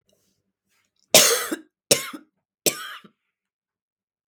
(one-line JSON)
{"three_cough_length": "4.3 s", "three_cough_amplitude": 32768, "three_cough_signal_mean_std_ratio": 0.26, "survey_phase": "beta (2021-08-13 to 2022-03-07)", "age": "18-44", "gender": "Female", "wearing_mask": "No", "symptom_cough_any": true, "symptom_new_continuous_cough": true, "symptom_sore_throat": true, "symptom_fatigue": true, "symptom_fever_high_temperature": true, "symptom_headache": true, "symptom_change_to_sense_of_smell_or_taste": true, "symptom_onset": "2 days", "smoker_status": "Never smoked", "respiratory_condition_asthma": true, "respiratory_condition_other": false, "recruitment_source": "Test and Trace", "submission_delay": "1 day", "covid_test_result": "Positive", "covid_test_method": "ePCR"}